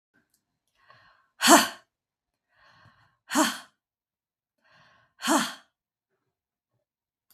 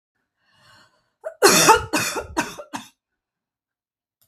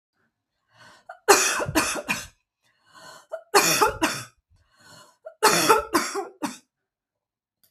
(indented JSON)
{
  "exhalation_length": "7.3 s",
  "exhalation_amplitude": 21805,
  "exhalation_signal_mean_std_ratio": 0.23,
  "cough_length": "4.3 s",
  "cough_amplitude": 32675,
  "cough_signal_mean_std_ratio": 0.32,
  "three_cough_length": "7.7 s",
  "three_cough_amplitude": 32767,
  "three_cough_signal_mean_std_ratio": 0.4,
  "survey_phase": "beta (2021-08-13 to 2022-03-07)",
  "age": "45-64",
  "gender": "Female",
  "wearing_mask": "No",
  "symptom_cough_any": true,
  "symptom_runny_or_blocked_nose": true,
  "symptom_fatigue": true,
  "symptom_onset": "11 days",
  "smoker_status": "Never smoked",
  "respiratory_condition_asthma": true,
  "respiratory_condition_other": true,
  "recruitment_source": "REACT",
  "submission_delay": "1 day",
  "covid_test_result": "Negative",
  "covid_test_method": "RT-qPCR",
  "influenza_a_test_result": "Negative",
  "influenza_b_test_result": "Negative"
}